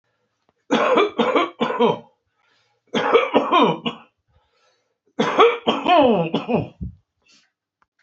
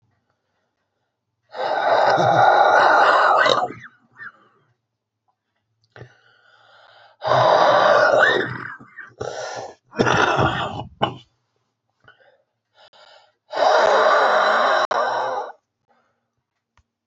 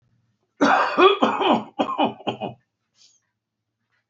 {"three_cough_length": "8.0 s", "three_cough_amplitude": 30705, "three_cough_signal_mean_std_ratio": 0.51, "exhalation_length": "17.1 s", "exhalation_amplitude": 29441, "exhalation_signal_mean_std_ratio": 0.53, "cough_length": "4.1 s", "cough_amplitude": 25880, "cough_signal_mean_std_ratio": 0.45, "survey_phase": "beta (2021-08-13 to 2022-03-07)", "age": "65+", "gender": "Male", "wearing_mask": "No", "symptom_cough_any": true, "symptom_new_continuous_cough": true, "symptom_runny_or_blocked_nose": true, "symptom_shortness_of_breath": true, "symptom_abdominal_pain": true, "symptom_fatigue": true, "symptom_headache": true, "symptom_other": true, "smoker_status": "Current smoker (1 to 10 cigarettes per day)", "respiratory_condition_asthma": true, "respiratory_condition_other": true, "recruitment_source": "Test and Trace", "submission_delay": "1 day", "covid_test_result": "Positive", "covid_test_method": "RT-qPCR", "covid_ct_value": 20.2, "covid_ct_gene": "ORF1ab gene", "covid_ct_mean": 20.9, "covid_viral_load": "140000 copies/ml", "covid_viral_load_category": "Low viral load (10K-1M copies/ml)"}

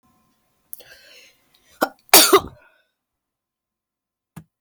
{"cough_length": "4.6 s", "cough_amplitude": 32768, "cough_signal_mean_std_ratio": 0.21, "survey_phase": "beta (2021-08-13 to 2022-03-07)", "age": "45-64", "gender": "Female", "wearing_mask": "No", "symptom_shortness_of_breath": true, "smoker_status": "Never smoked", "respiratory_condition_asthma": false, "respiratory_condition_other": false, "recruitment_source": "REACT", "submission_delay": "2 days", "covid_test_result": "Negative", "covid_test_method": "RT-qPCR", "influenza_a_test_result": "Negative", "influenza_b_test_result": "Negative"}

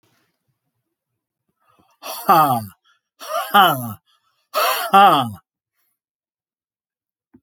{"exhalation_length": "7.4 s", "exhalation_amplitude": 28446, "exhalation_signal_mean_std_ratio": 0.35, "survey_phase": "alpha (2021-03-01 to 2021-08-12)", "age": "65+", "gender": "Male", "wearing_mask": "No", "symptom_none": true, "smoker_status": "Never smoked", "respiratory_condition_asthma": false, "respiratory_condition_other": false, "recruitment_source": "REACT", "submission_delay": "2 days", "covid_test_result": "Negative", "covid_test_method": "RT-qPCR"}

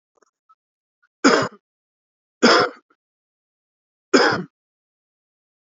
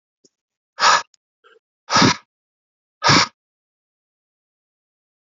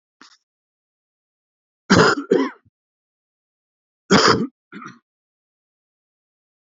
{"three_cough_length": "5.7 s", "three_cough_amplitude": 29070, "three_cough_signal_mean_std_ratio": 0.28, "exhalation_length": "5.2 s", "exhalation_amplitude": 30763, "exhalation_signal_mean_std_ratio": 0.28, "cough_length": "6.7 s", "cough_amplitude": 28801, "cough_signal_mean_std_ratio": 0.27, "survey_phase": "alpha (2021-03-01 to 2021-08-12)", "age": "18-44", "gender": "Male", "wearing_mask": "No", "symptom_cough_any": true, "symptom_headache": true, "symptom_change_to_sense_of_smell_or_taste": true, "symptom_loss_of_taste": true, "smoker_status": "Ex-smoker", "respiratory_condition_asthma": false, "respiratory_condition_other": false, "recruitment_source": "Test and Trace", "submission_delay": "3 days", "covid_test_result": "Positive", "covid_test_method": "RT-qPCR"}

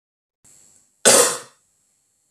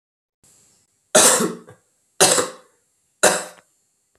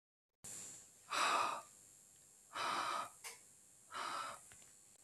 {"cough_length": "2.3 s", "cough_amplitude": 32768, "cough_signal_mean_std_ratio": 0.28, "three_cough_length": "4.2 s", "three_cough_amplitude": 32768, "three_cough_signal_mean_std_ratio": 0.34, "exhalation_length": "5.0 s", "exhalation_amplitude": 2027, "exhalation_signal_mean_std_ratio": 0.53, "survey_phase": "beta (2021-08-13 to 2022-03-07)", "age": "18-44", "gender": "Male", "wearing_mask": "No", "symptom_runny_or_blocked_nose": true, "smoker_status": "Never smoked", "respiratory_condition_asthma": false, "respiratory_condition_other": false, "recruitment_source": "REACT", "submission_delay": "8 days", "covid_test_result": "Negative", "covid_test_method": "RT-qPCR"}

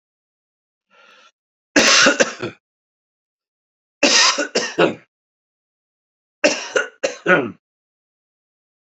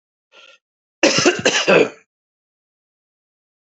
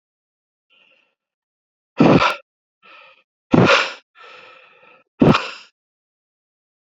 {"three_cough_length": "9.0 s", "three_cough_amplitude": 29860, "three_cough_signal_mean_std_ratio": 0.35, "cough_length": "3.7 s", "cough_amplitude": 29247, "cough_signal_mean_std_ratio": 0.35, "exhalation_length": "6.9 s", "exhalation_amplitude": 29800, "exhalation_signal_mean_std_ratio": 0.29, "survey_phase": "beta (2021-08-13 to 2022-03-07)", "age": "45-64", "gender": "Male", "wearing_mask": "No", "symptom_cough_any": true, "symptom_new_continuous_cough": true, "symptom_runny_or_blocked_nose": true, "symptom_abdominal_pain": true, "symptom_fatigue": true, "symptom_fever_high_temperature": true, "symptom_onset": "6 days", "smoker_status": "Never smoked", "respiratory_condition_asthma": false, "respiratory_condition_other": false, "recruitment_source": "Test and Trace", "submission_delay": "2 days", "covid_test_result": "Positive", "covid_test_method": "RT-qPCR", "covid_ct_value": 19.4, "covid_ct_gene": "ORF1ab gene", "covid_ct_mean": 20.6, "covid_viral_load": "180000 copies/ml", "covid_viral_load_category": "Low viral load (10K-1M copies/ml)"}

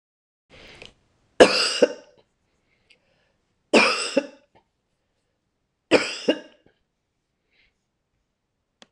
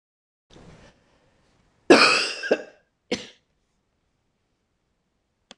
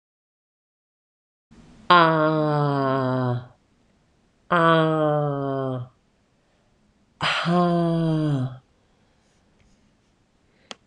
{"three_cough_length": "8.9 s", "three_cough_amplitude": 26028, "three_cough_signal_mean_std_ratio": 0.25, "cough_length": "5.6 s", "cough_amplitude": 26028, "cough_signal_mean_std_ratio": 0.24, "exhalation_length": "10.9 s", "exhalation_amplitude": 25091, "exhalation_signal_mean_std_ratio": 0.52, "survey_phase": "beta (2021-08-13 to 2022-03-07)", "age": "45-64", "gender": "Female", "wearing_mask": "No", "symptom_runny_or_blocked_nose": true, "smoker_status": "Never smoked", "respiratory_condition_asthma": false, "respiratory_condition_other": false, "recruitment_source": "REACT", "submission_delay": "1 day", "covid_test_result": "Negative", "covid_test_method": "RT-qPCR"}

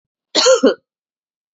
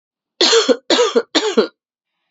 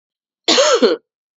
{"exhalation_length": "1.5 s", "exhalation_amplitude": 30584, "exhalation_signal_mean_std_ratio": 0.4, "three_cough_length": "2.3 s", "three_cough_amplitude": 31708, "three_cough_signal_mean_std_ratio": 0.53, "cough_length": "1.4 s", "cough_amplitude": 30364, "cough_signal_mean_std_ratio": 0.51, "survey_phase": "beta (2021-08-13 to 2022-03-07)", "age": "18-44", "gender": "Female", "wearing_mask": "No", "symptom_new_continuous_cough": true, "symptom_runny_or_blocked_nose": true, "symptom_shortness_of_breath": true, "symptom_sore_throat": true, "symptom_diarrhoea": true, "symptom_fatigue": true, "symptom_headache": true, "symptom_change_to_sense_of_smell_or_taste": true, "symptom_loss_of_taste": true, "symptom_onset": "3 days", "smoker_status": "Never smoked", "respiratory_condition_asthma": false, "respiratory_condition_other": false, "recruitment_source": "Test and Trace", "submission_delay": "2 days", "covid_test_result": "Positive", "covid_test_method": "RT-qPCR", "covid_ct_value": 22.4, "covid_ct_gene": "ORF1ab gene", "covid_ct_mean": 23.2, "covid_viral_load": "25000 copies/ml", "covid_viral_load_category": "Low viral load (10K-1M copies/ml)"}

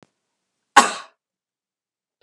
{"cough_length": "2.2 s", "cough_amplitude": 32768, "cough_signal_mean_std_ratio": 0.17, "survey_phase": "beta (2021-08-13 to 2022-03-07)", "age": "65+", "gender": "Female", "wearing_mask": "No", "symptom_none": true, "smoker_status": "Never smoked", "respiratory_condition_asthma": false, "respiratory_condition_other": false, "recruitment_source": "REACT", "submission_delay": "2 days", "covid_test_result": "Negative", "covid_test_method": "RT-qPCR", "influenza_a_test_result": "Negative", "influenza_b_test_result": "Negative"}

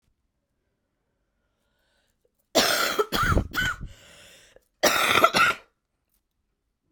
{"cough_length": "6.9 s", "cough_amplitude": 23685, "cough_signal_mean_std_ratio": 0.4, "survey_phase": "alpha (2021-03-01 to 2021-08-12)", "age": "18-44", "gender": "Female", "wearing_mask": "No", "symptom_cough_any": true, "symptom_shortness_of_breath": true, "symptom_fatigue": true, "symptom_change_to_sense_of_smell_or_taste": true, "symptom_loss_of_taste": true, "symptom_onset": "4 days", "smoker_status": "Current smoker (1 to 10 cigarettes per day)", "respiratory_condition_asthma": true, "respiratory_condition_other": false, "recruitment_source": "Test and Trace", "submission_delay": "1 day", "covid_test_result": "Positive", "covid_test_method": "RT-qPCR", "covid_ct_value": 23.0, "covid_ct_gene": "ORF1ab gene"}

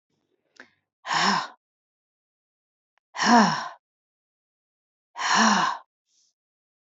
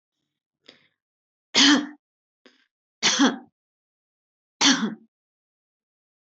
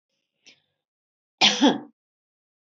{"exhalation_length": "7.0 s", "exhalation_amplitude": 21291, "exhalation_signal_mean_std_ratio": 0.34, "three_cough_length": "6.4 s", "three_cough_amplitude": 23906, "three_cough_signal_mean_std_ratio": 0.29, "cough_length": "2.6 s", "cough_amplitude": 19609, "cough_signal_mean_std_ratio": 0.27, "survey_phase": "beta (2021-08-13 to 2022-03-07)", "age": "65+", "gender": "Female", "wearing_mask": "No", "symptom_none": true, "smoker_status": "Never smoked", "respiratory_condition_asthma": false, "respiratory_condition_other": false, "recruitment_source": "REACT", "submission_delay": "1 day", "covid_test_result": "Negative", "covid_test_method": "RT-qPCR", "influenza_a_test_result": "Negative", "influenza_b_test_result": "Negative"}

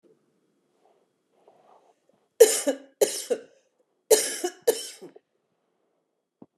{"three_cough_length": "6.6 s", "three_cough_amplitude": 27795, "three_cough_signal_mean_std_ratio": 0.25, "survey_phase": "beta (2021-08-13 to 2022-03-07)", "age": "45-64", "gender": "Female", "wearing_mask": "No", "symptom_fatigue": true, "symptom_headache": true, "symptom_change_to_sense_of_smell_or_taste": true, "smoker_status": "Ex-smoker", "respiratory_condition_asthma": false, "respiratory_condition_other": false, "recruitment_source": "Test and Trace", "submission_delay": "1 day", "covid_test_result": "Positive", "covid_test_method": "RT-qPCR", "covid_ct_value": 16.0, "covid_ct_gene": "ORF1ab gene"}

